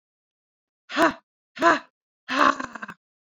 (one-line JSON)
{"exhalation_length": "3.2 s", "exhalation_amplitude": 20988, "exhalation_signal_mean_std_ratio": 0.35, "survey_phase": "beta (2021-08-13 to 2022-03-07)", "age": "18-44", "gender": "Female", "wearing_mask": "No", "symptom_abdominal_pain": true, "symptom_fatigue": true, "smoker_status": "Never smoked", "respiratory_condition_asthma": false, "respiratory_condition_other": false, "recruitment_source": "REACT", "submission_delay": "2 days", "covid_test_result": "Negative", "covid_test_method": "RT-qPCR"}